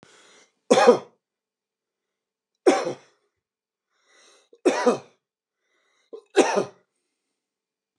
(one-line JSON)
{"three_cough_length": "8.0 s", "three_cough_amplitude": 28675, "three_cough_signal_mean_std_ratio": 0.27, "survey_phase": "beta (2021-08-13 to 2022-03-07)", "age": "65+", "gender": "Male", "wearing_mask": "No", "symptom_cough_any": true, "symptom_runny_or_blocked_nose": true, "symptom_change_to_sense_of_smell_or_taste": true, "symptom_loss_of_taste": true, "symptom_onset": "2 days", "smoker_status": "Never smoked", "respiratory_condition_asthma": false, "respiratory_condition_other": false, "recruitment_source": "Test and Trace", "submission_delay": "2 days", "covid_test_result": "Positive", "covid_test_method": "RT-qPCR", "covid_ct_value": 18.4, "covid_ct_gene": "S gene", "covid_ct_mean": 18.6, "covid_viral_load": "780000 copies/ml", "covid_viral_load_category": "Low viral load (10K-1M copies/ml)"}